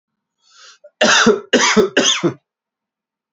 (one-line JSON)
{"three_cough_length": "3.3 s", "three_cough_amplitude": 32767, "three_cough_signal_mean_std_ratio": 0.47, "survey_phase": "beta (2021-08-13 to 2022-03-07)", "age": "45-64", "gender": "Male", "wearing_mask": "No", "symptom_cough_any": true, "symptom_runny_or_blocked_nose": true, "symptom_onset": "7 days", "smoker_status": "Never smoked", "respiratory_condition_asthma": true, "respiratory_condition_other": false, "recruitment_source": "Test and Trace", "submission_delay": "3 days", "covid_test_result": "Negative", "covid_test_method": "LAMP"}